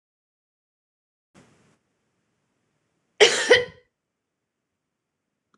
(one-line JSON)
{"cough_length": "5.6 s", "cough_amplitude": 25871, "cough_signal_mean_std_ratio": 0.19, "survey_phase": "beta (2021-08-13 to 2022-03-07)", "age": "18-44", "gender": "Female", "wearing_mask": "No", "symptom_none": true, "smoker_status": "Prefer not to say", "respiratory_condition_asthma": false, "respiratory_condition_other": false, "recruitment_source": "REACT", "submission_delay": "9 days", "covid_test_result": "Negative", "covid_test_method": "RT-qPCR"}